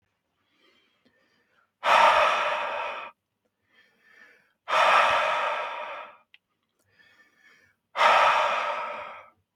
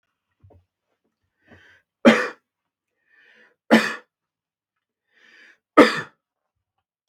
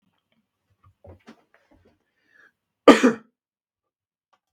{"exhalation_length": "9.6 s", "exhalation_amplitude": 15063, "exhalation_signal_mean_std_ratio": 0.47, "three_cough_length": "7.1 s", "three_cough_amplitude": 32768, "three_cough_signal_mean_std_ratio": 0.21, "cough_length": "4.5 s", "cough_amplitude": 32768, "cough_signal_mean_std_ratio": 0.16, "survey_phase": "beta (2021-08-13 to 2022-03-07)", "age": "18-44", "gender": "Male", "wearing_mask": "No", "symptom_none": true, "smoker_status": "Never smoked", "respiratory_condition_asthma": false, "respiratory_condition_other": false, "recruitment_source": "REACT", "submission_delay": "2 days", "covid_test_result": "Negative", "covid_test_method": "RT-qPCR", "influenza_a_test_result": "Negative", "influenza_b_test_result": "Negative"}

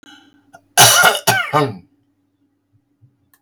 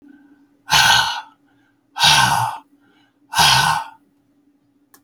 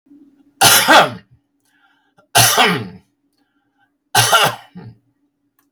{"cough_length": "3.4 s", "cough_amplitude": 32768, "cough_signal_mean_std_ratio": 0.38, "exhalation_length": "5.0 s", "exhalation_amplitude": 32768, "exhalation_signal_mean_std_ratio": 0.46, "three_cough_length": "5.7 s", "three_cough_amplitude": 32768, "three_cough_signal_mean_std_ratio": 0.4, "survey_phase": "beta (2021-08-13 to 2022-03-07)", "age": "45-64", "gender": "Male", "wearing_mask": "No", "symptom_cough_any": true, "smoker_status": "Never smoked", "respiratory_condition_asthma": false, "respiratory_condition_other": false, "recruitment_source": "REACT", "submission_delay": "1 day", "covid_test_result": "Negative", "covid_test_method": "RT-qPCR"}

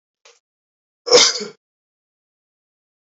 {"cough_length": "3.2 s", "cough_amplitude": 32768, "cough_signal_mean_std_ratio": 0.23, "survey_phase": "beta (2021-08-13 to 2022-03-07)", "age": "18-44", "gender": "Male", "wearing_mask": "No", "symptom_none": true, "smoker_status": "Never smoked", "respiratory_condition_asthma": false, "respiratory_condition_other": false, "recruitment_source": "REACT", "submission_delay": "1 day", "covid_test_result": "Negative", "covid_test_method": "RT-qPCR"}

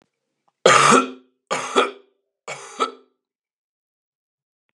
{"three_cough_length": "4.7 s", "three_cough_amplitude": 32636, "three_cough_signal_mean_std_ratio": 0.32, "survey_phase": "beta (2021-08-13 to 2022-03-07)", "age": "18-44", "gender": "Male", "wearing_mask": "No", "symptom_cough_any": true, "symptom_runny_or_blocked_nose": true, "symptom_sore_throat": true, "symptom_onset": "13 days", "smoker_status": "Never smoked", "respiratory_condition_asthma": false, "respiratory_condition_other": false, "recruitment_source": "REACT", "submission_delay": "2 days", "covid_test_result": "Negative", "covid_test_method": "RT-qPCR", "influenza_a_test_result": "Negative", "influenza_b_test_result": "Negative"}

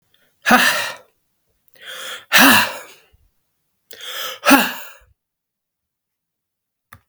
{"exhalation_length": "7.1 s", "exhalation_amplitude": 32768, "exhalation_signal_mean_std_ratio": 0.33, "survey_phase": "beta (2021-08-13 to 2022-03-07)", "age": "45-64", "gender": "Male", "wearing_mask": "No", "symptom_none": true, "smoker_status": "Ex-smoker", "respiratory_condition_asthma": false, "respiratory_condition_other": false, "recruitment_source": "REACT", "submission_delay": "1 day", "covid_test_result": "Negative", "covid_test_method": "RT-qPCR", "influenza_a_test_result": "Negative", "influenza_b_test_result": "Negative"}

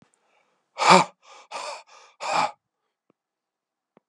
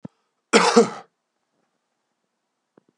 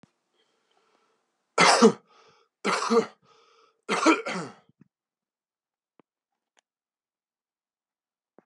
{"exhalation_length": "4.1 s", "exhalation_amplitude": 32138, "exhalation_signal_mean_std_ratio": 0.27, "cough_length": "3.0 s", "cough_amplitude": 32106, "cough_signal_mean_std_ratio": 0.26, "three_cough_length": "8.5 s", "three_cough_amplitude": 19227, "three_cough_signal_mean_std_ratio": 0.27, "survey_phase": "beta (2021-08-13 to 2022-03-07)", "age": "45-64", "gender": "Male", "wearing_mask": "No", "symptom_cough_any": true, "symptom_runny_or_blocked_nose": true, "symptom_fatigue": true, "symptom_onset": "3 days", "smoker_status": "Ex-smoker", "respiratory_condition_asthma": false, "respiratory_condition_other": false, "recruitment_source": "Test and Trace", "submission_delay": "2 days", "covid_test_result": "Positive", "covid_test_method": "ePCR"}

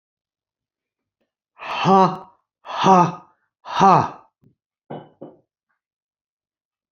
{"exhalation_length": "6.9 s", "exhalation_amplitude": 28770, "exhalation_signal_mean_std_ratio": 0.31, "survey_phase": "beta (2021-08-13 to 2022-03-07)", "age": "65+", "gender": "Male", "wearing_mask": "No", "symptom_none": true, "smoker_status": "Never smoked", "respiratory_condition_asthma": false, "respiratory_condition_other": false, "recruitment_source": "REACT", "submission_delay": "6 days", "covid_test_result": "Negative", "covid_test_method": "RT-qPCR", "influenza_a_test_result": "Negative", "influenza_b_test_result": "Negative"}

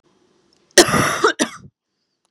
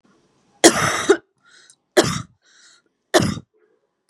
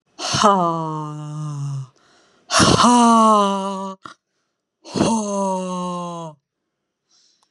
{"cough_length": "2.3 s", "cough_amplitude": 32768, "cough_signal_mean_std_ratio": 0.36, "three_cough_length": "4.1 s", "three_cough_amplitude": 32768, "three_cough_signal_mean_std_ratio": 0.32, "exhalation_length": "7.5 s", "exhalation_amplitude": 32337, "exhalation_signal_mean_std_ratio": 0.57, "survey_phase": "beta (2021-08-13 to 2022-03-07)", "age": "18-44", "gender": "Female", "wearing_mask": "No", "symptom_none": true, "smoker_status": "Ex-smoker", "respiratory_condition_asthma": false, "respiratory_condition_other": false, "recruitment_source": "REACT", "submission_delay": "2 days", "covid_test_result": "Negative", "covid_test_method": "RT-qPCR", "influenza_a_test_result": "Negative", "influenza_b_test_result": "Negative"}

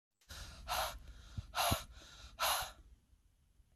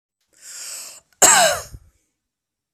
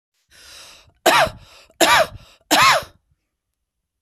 {"exhalation_length": "3.8 s", "exhalation_amplitude": 3163, "exhalation_signal_mean_std_ratio": 0.49, "cough_length": "2.7 s", "cough_amplitude": 32768, "cough_signal_mean_std_ratio": 0.33, "three_cough_length": "4.0 s", "three_cough_amplitude": 32254, "three_cough_signal_mean_std_ratio": 0.38, "survey_phase": "beta (2021-08-13 to 2022-03-07)", "age": "45-64", "gender": "Female", "wearing_mask": "No", "symptom_none": true, "smoker_status": "Never smoked", "respiratory_condition_asthma": false, "respiratory_condition_other": false, "recruitment_source": "REACT", "submission_delay": "1 day", "covid_test_result": "Negative", "covid_test_method": "RT-qPCR", "influenza_a_test_result": "Unknown/Void", "influenza_b_test_result": "Unknown/Void"}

